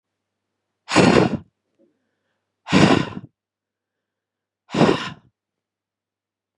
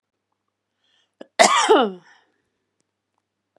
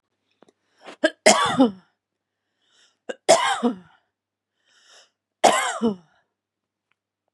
exhalation_length: 6.6 s
exhalation_amplitude: 31666
exhalation_signal_mean_std_ratio: 0.31
cough_length: 3.6 s
cough_amplitude: 32768
cough_signal_mean_std_ratio: 0.28
three_cough_length: 7.3 s
three_cough_amplitude: 32125
three_cough_signal_mean_std_ratio: 0.31
survey_phase: beta (2021-08-13 to 2022-03-07)
age: 45-64
gender: Female
wearing_mask: 'No'
symptom_none: true
smoker_status: Never smoked
respiratory_condition_asthma: false
respiratory_condition_other: false
recruitment_source: Test and Trace
submission_delay: 1 day
covid_test_result: Negative
covid_test_method: ePCR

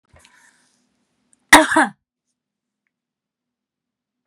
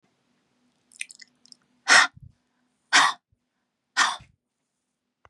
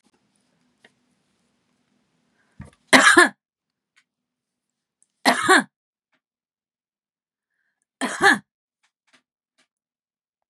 cough_length: 4.3 s
cough_amplitude: 32768
cough_signal_mean_std_ratio: 0.19
exhalation_length: 5.3 s
exhalation_amplitude: 26187
exhalation_signal_mean_std_ratio: 0.25
three_cough_length: 10.5 s
three_cough_amplitude: 32768
three_cough_signal_mean_std_ratio: 0.22
survey_phase: beta (2021-08-13 to 2022-03-07)
age: 65+
gender: Female
wearing_mask: 'No'
symptom_none: true
smoker_status: Ex-smoker
respiratory_condition_asthma: false
respiratory_condition_other: false
recruitment_source: REACT
submission_delay: 1 day
covid_test_result: Negative
covid_test_method: RT-qPCR
influenza_a_test_result: Negative
influenza_b_test_result: Negative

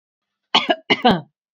cough_length: 1.5 s
cough_amplitude: 31958
cough_signal_mean_std_ratio: 0.38
survey_phase: beta (2021-08-13 to 2022-03-07)
age: 45-64
gender: Female
wearing_mask: 'No'
symptom_none: true
smoker_status: Never smoked
respiratory_condition_asthma: false
respiratory_condition_other: false
recruitment_source: REACT
submission_delay: 1 day
covid_test_result: Negative
covid_test_method: RT-qPCR
influenza_a_test_result: Negative
influenza_b_test_result: Negative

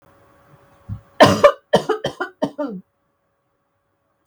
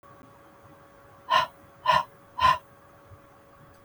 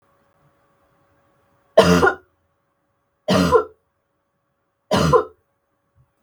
cough_length: 4.3 s
cough_amplitude: 32768
cough_signal_mean_std_ratio: 0.3
exhalation_length: 3.8 s
exhalation_amplitude: 12420
exhalation_signal_mean_std_ratio: 0.34
three_cough_length: 6.2 s
three_cough_amplitude: 32768
three_cough_signal_mean_std_ratio: 0.32
survey_phase: beta (2021-08-13 to 2022-03-07)
age: 45-64
gender: Female
wearing_mask: 'No'
symptom_cough_any: true
symptom_runny_or_blocked_nose: true
symptom_headache: true
smoker_status: Never smoked
respiratory_condition_asthma: false
respiratory_condition_other: false
recruitment_source: Test and Trace
submission_delay: 3 days
covid_test_result: Positive
covid_test_method: RT-qPCR
covid_ct_value: 18.8
covid_ct_gene: ORF1ab gene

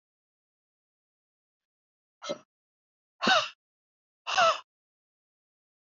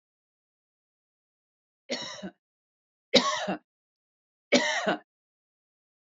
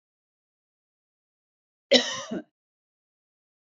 exhalation_length: 5.8 s
exhalation_amplitude: 8581
exhalation_signal_mean_std_ratio: 0.24
three_cough_length: 6.1 s
three_cough_amplitude: 19111
three_cough_signal_mean_std_ratio: 0.28
cough_length: 3.8 s
cough_amplitude: 23390
cough_signal_mean_std_ratio: 0.19
survey_phase: beta (2021-08-13 to 2022-03-07)
age: 45-64
gender: Female
wearing_mask: 'No'
symptom_fatigue: true
smoker_status: Ex-smoker
respiratory_condition_asthma: false
respiratory_condition_other: false
recruitment_source: REACT
submission_delay: 2 days
covid_test_result: Negative
covid_test_method: RT-qPCR
influenza_a_test_result: Negative
influenza_b_test_result: Negative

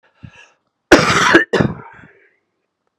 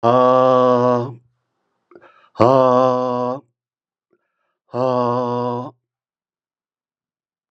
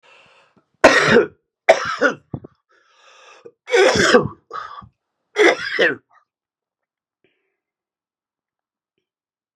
cough_length: 3.0 s
cough_amplitude: 32768
cough_signal_mean_std_ratio: 0.38
exhalation_length: 7.5 s
exhalation_amplitude: 32767
exhalation_signal_mean_std_ratio: 0.46
three_cough_length: 9.6 s
three_cough_amplitude: 32768
three_cough_signal_mean_std_ratio: 0.34
survey_phase: beta (2021-08-13 to 2022-03-07)
age: 45-64
gender: Male
wearing_mask: 'No'
symptom_runny_or_blocked_nose: true
symptom_sore_throat: true
symptom_fatigue: true
symptom_fever_high_temperature: true
symptom_headache: true
symptom_onset: 6 days
smoker_status: Never smoked
respiratory_condition_asthma: false
respiratory_condition_other: false
recruitment_source: Test and Trace
submission_delay: 2 days
covid_test_result: Positive
covid_test_method: RT-qPCR
covid_ct_value: 12.8
covid_ct_gene: ORF1ab gene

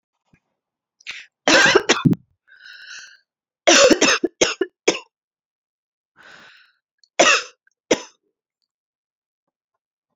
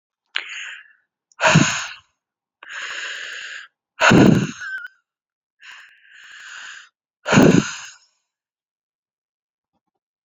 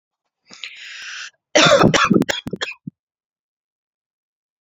three_cough_length: 10.2 s
three_cough_amplitude: 32035
three_cough_signal_mean_std_ratio: 0.31
exhalation_length: 10.2 s
exhalation_amplitude: 29470
exhalation_signal_mean_std_ratio: 0.33
cough_length: 4.6 s
cough_amplitude: 32767
cough_signal_mean_std_ratio: 0.35
survey_phase: alpha (2021-03-01 to 2021-08-12)
age: 18-44
gender: Female
wearing_mask: 'No'
symptom_fatigue: true
smoker_status: Ex-smoker
respiratory_condition_asthma: false
respiratory_condition_other: false
recruitment_source: Test and Trace
submission_delay: 1 day
covid_test_result: Positive
covid_test_method: LFT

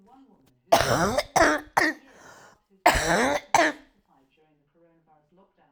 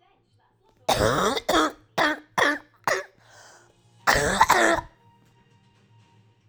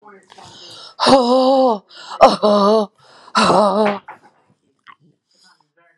three_cough_length: 5.7 s
three_cough_amplitude: 21438
three_cough_signal_mean_std_ratio: 0.42
cough_length: 6.5 s
cough_amplitude: 25057
cough_signal_mean_std_ratio: 0.45
exhalation_length: 6.0 s
exhalation_amplitude: 32768
exhalation_signal_mean_std_ratio: 0.49
survey_phase: alpha (2021-03-01 to 2021-08-12)
age: 45-64
gender: Female
wearing_mask: 'No'
symptom_new_continuous_cough: true
symptom_shortness_of_breath: true
symptom_abdominal_pain: true
symptom_diarrhoea: true
symptom_fatigue: true
symptom_fever_high_temperature: true
symptom_headache: true
symptom_onset: 3 days
smoker_status: Ex-smoker
respiratory_condition_asthma: false
respiratory_condition_other: false
recruitment_source: Test and Trace
submission_delay: 2 days
covid_test_result: Positive
covid_test_method: RT-qPCR
covid_ct_value: 18.0
covid_ct_gene: ORF1ab gene
covid_ct_mean: 18.2
covid_viral_load: 1100000 copies/ml
covid_viral_load_category: High viral load (>1M copies/ml)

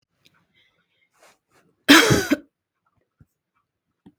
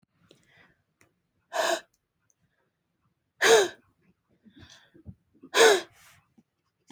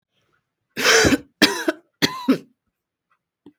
cough_length: 4.2 s
cough_amplitude: 32768
cough_signal_mean_std_ratio: 0.23
exhalation_length: 6.9 s
exhalation_amplitude: 17903
exhalation_signal_mean_std_ratio: 0.26
three_cough_length: 3.6 s
three_cough_amplitude: 32767
three_cough_signal_mean_std_ratio: 0.37
survey_phase: beta (2021-08-13 to 2022-03-07)
age: 45-64
gender: Female
wearing_mask: 'No'
symptom_none: true
smoker_status: Never smoked
respiratory_condition_asthma: false
respiratory_condition_other: false
recruitment_source: REACT
submission_delay: 2 days
covid_test_result: Negative
covid_test_method: RT-qPCR
influenza_a_test_result: Negative
influenza_b_test_result: Negative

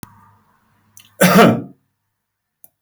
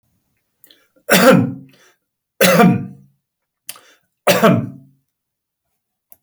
cough_length: 2.8 s
cough_amplitude: 32768
cough_signal_mean_std_ratio: 0.31
three_cough_length: 6.2 s
three_cough_amplitude: 32768
three_cough_signal_mean_std_ratio: 0.37
survey_phase: beta (2021-08-13 to 2022-03-07)
age: 65+
gender: Male
wearing_mask: 'No'
symptom_none: true
smoker_status: Current smoker (1 to 10 cigarettes per day)
respiratory_condition_asthma: false
respiratory_condition_other: false
recruitment_source: REACT
submission_delay: 4 days
covid_test_result: Negative
covid_test_method: RT-qPCR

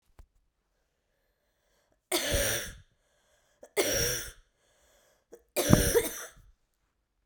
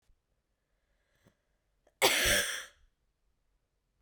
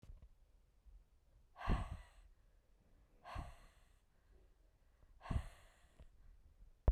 three_cough_length: 7.3 s
three_cough_amplitude: 22505
three_cough_signal_mean_std_ratio: 0.36
cough_length: 4.0 s
cough_amplitude: 10507
cough_signal_mean_std_ratio: 0.3
exhalation_length: 6.9 s
exhalation_amplitude: 3294
exhalation_signal_mean_std_ratio: 0.28
survey_phase: beta (2021-08-13 to 2022-03-07)
age: 18-44
gender: Female
wearing_mask: 'No'
symptom_runny_or_blocked_nose: true
symptom_abdominal_pain: true
symptom_diarrhoea: true
symptom_onset: 9 days
smoker_status: Never smoked
respiratory_condition_asthma: false
respiratory_condition_other: false
recruitment_source: Test and Trace
submission_delay: 2 days
covid_test_result: Positive
covid_test_method: RT-qPCR
covid_ct_value: 22.4
covid_ct_gene: ORF1ab gene
covid_ct_mean: 23.2
covid_viral_load: 25000 copies/ml
covid_viral_load_category: Low viral load (10K-1M copies/ml)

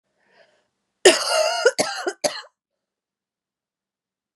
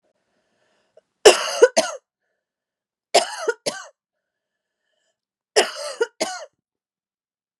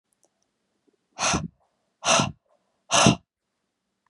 cough_length: 4.4 s
cough_amplitude: 32688
cough_signal_mean_std_ratio: 0.32
three_cough_length: 7.6 s
three_cough_amplitude: 32768
three_cough_signal_mean_std_ratio: 0.25
exhalation_length: 4.1 s
exhalation_amplitude: 26840
exhalation_signal_mean_std_ratio: 0.32
survey_phase: beta (2021-08-13 to 2022-03-07)
age: 45-64
gender: Female
wearing_mask: 'No'
symptom_cough_any: true
symptom_runny_or_blocked_nose: true
symptom_fever_high_temperature: true
smoker_status: Ex-smoker
respiratory_condition_asthma: false
respiratory_condition_other: false
recruitment_source: Test and Trace
submission_delay: 1 day
covid_test_result: Positive
covid_test_method: LFT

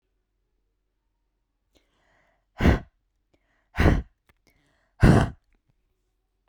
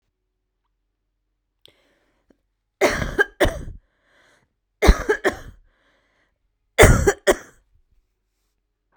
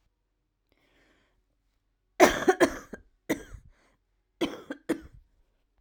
exhalation_length: 6.5 s
exhalation_amplitude: 25260
exhalation_signal_mean_std_ratio: 0.25
three_cough_length: 9.0 s
three_cough_amplitude: 32768
three_cough_signal_mean_std_ratio: 0.27
cough_length: 5.8 s
cough_amplitude: 22769
cough_signal_mean_std_ratio: 0.24
survey_phase: beta (2021-08-13 to 2022-03-07)
age: 18-44
gender: Female
wearing_mask: 'No'
symptom_cough_any: true
symptom_sore_throat: true
symptom_headache: true
symptom_onset: 3 days
smoker_status: Ex-smoker
respiratory_condition_asthma: false
respiratory_condition_other: false
recruitment_source: Test and Trace
submission_delay: 2 days
covid_test_result: Negative
covid_test_method: RT-qPCR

